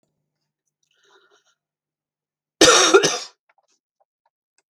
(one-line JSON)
{"cough_length": "4.7 s", "cough_amplitude": 32768, "cough_signal_mean_std_ratio": 0.26, "survey_phase": "beta (2021-08-13 to 2022-03-07)", "age": "65+", "gender": "Female", "wearing_mask": "No", "symptom_cough_any": true, "smoker_status": "Ex-smoker", "respiratory_condition_asthma": false, "respiratory_condition_other": false, "recruitment_source": "REACT", "submission_delay": "2 days", "covid_test_result": "Negative", "covid_test_method": "RT-qPCR"}